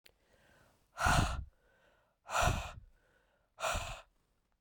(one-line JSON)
{"exhalation_length": "4.6 s", "exhalation_amplitude": 4795, "exhalation_signal_mean_std_ratio": 0.4, "survey_phase": "beta (2021-08-13 to 2022-03-07)", "age": "18-44", "gender": "Female", "wearing_mask": "No", "symptom_runny_or_blocked_nose": true, "symptom_fatigue": true, "symptom_headache": true, "symptom_onset": "1 day", "smoker_status": "Never smoked", "respiratory_condition_asthma": false, "respiratory_condition_other": false, "recruitment_source": "Test and Trace", "submission_delay": "1 day", "covid_test_result": "Positive", "covid_test_method": "LAMP"}